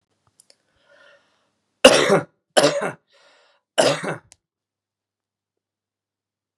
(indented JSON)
{
  "three_cough_length": "6.6 s",
  "three_cough_amplitude": 32768,
  "three_cough_signal_mean_std_ratio": 0.27,
  "survey_phase": "beta (2021-08-13 to 2022-03-07)",
  "age": "45-64",
  "gender": "Male",
  "wearing_mask": "No",
  "symptom_cough_any": true,
  "symptom_new_continuous_cough": true,
  "symptom_runny_or_blocked_nose": true,
  "symptom_sore_throat": true,
  "symptom_fatigue": true,
  "symptom_onset": "2 days",
  "smoker_status": "Never smoked",
  "respiratory_condition_asthma": false,
  "respiratory_condition_other": false,
  "recruitment_source": "Test and Trace",
  "submission_delay": "2 days",
  "covid_test_result": "Positive",
  "covid_test_method": "RT-qPCR",
  "covid_ct_value": 23.0,
  "covid_ct_gene": "N gene"
}